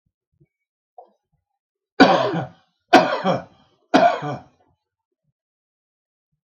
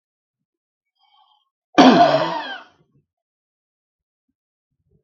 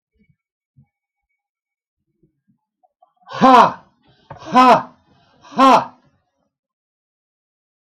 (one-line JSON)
{"three_cough_length": "6.5 s", "three_cough_amplitude": 32768, "three_cough_signal_mean_std_ratio": 0.3, "cough_length": "5.0 s", "cough_amplitude": 32768, "cough_signal_mean_std_ratio": 0.27, "exhalation_length": "7.9 s", "exhalation_amplitude": 32768, "exhalation_signal_mean_std_ratio": 0.27, "survey_phase": "beta (2021-08-13 to 2022-03-07)", "age": "65+", "gender": "Male", "wearing_mask": "No", "symptom_none": true, "smoker_status": "Never smoked", "respiratory_condition_asthma": false, "respiratory_condition_other": false, "recruitment_source": "REACT", "submission_delay": "8 days", "covid_test_result": "Negative", "covid_test_method": "RT-qPCR", "influenza_a_test_result": "Negative", "influenza_b_test_result": "Negative"}